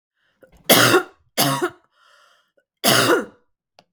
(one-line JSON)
{"three_cough_length": "3.9 s", "three_cough_amplitude": 32768, "three_cough_signal_mean_std_ratio": 0.41, "survey_phase": "beta (2021-08-13 to 2022-03-07)", "age": "45-64", "gender": "Female", "wearing_mask": "No", "symptom_cough_any": true, "symptom_runny_or_blocked_nose": true, "symptom_fatigue": true, "symptom_headache": true, "smoker_status": "Ex-smoker", "respiratory_condition_asthma": false, "respiratory_condition_other": false, "recruitment_source": "Test and Trace", "submission_delay": "2 days", "covid_test_result": "Positive", "covid_test_method": "RT-qPCR"}